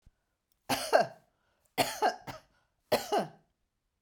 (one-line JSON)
{"three_cough_length": "4.0 s", "three_cough_amplitude": 10836, "three_cough_signal_mean_std_ratio": 0.36, "survey_phase": "beta (2021-08-13 to 2022-03-07)", "age": "45-64", "gender": "Female", "wearing_mask": "No", "symptom_none": true, "symptom_onset": "12 days", "smoker_status": "Never smoked", "respiratory_condition_asthma": false, "respiratory_condition_other": false, "recruitment_source": "REACT", "submission_delay": "2 days", "covid_test_result": "Negative", "covid_test_method": "RT-qPCR"}